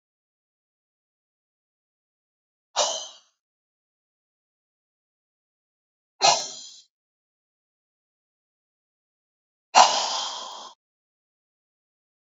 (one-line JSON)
{"exhalation_length": "12.4 s", "exhalation_amplitude": 28372, "exhalation_signal_mean_std_ratio": 0.2, "survey_phase": "alpha (2021-03-01 to 2021-08-12)", "age": "65+", "gender": "Female", "wearing_mask": "No", "symptom_shortness_of_breath": true, "symptom_fatigue": true, "symptom_change_to_sense_of_smell_or_taste": true, "symptom_onset": "12 days", "smoker_status": "Never smoked", "respiratory_condition_asthma": true, "respiratory_condition_other": false, "recruitment_source": "REACT", "submission_delay": "1 day", "covid_test_result": "Negative", "covid_test_method": "RT-qPCR"}